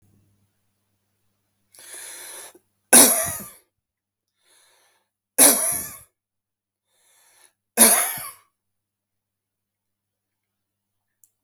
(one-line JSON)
{"three_cough_length": "11.4 s", "three_cough_amplitude": 32768, "three_cough_signal_mean_std_ratio": 0.24, "survey_phase": "beta (2021-08-13 to 2022-03-07)", "age": "45-64", "gender": "Male", "wearing_mask": "No", "symptom_none": true, "smoker_status": "Ex-smoker", "respiratory_condition_asthma": false, "respiratory_condition_other": false, "recruitment_source": "REACT", "submission_delay": "2 days", "covid_test_result": "Negative", "covid_test_method": "RT-qPCR", "influenza_a_test_result": "Unknown/Void", "influenza_b_test_result": "Unknown/Void"}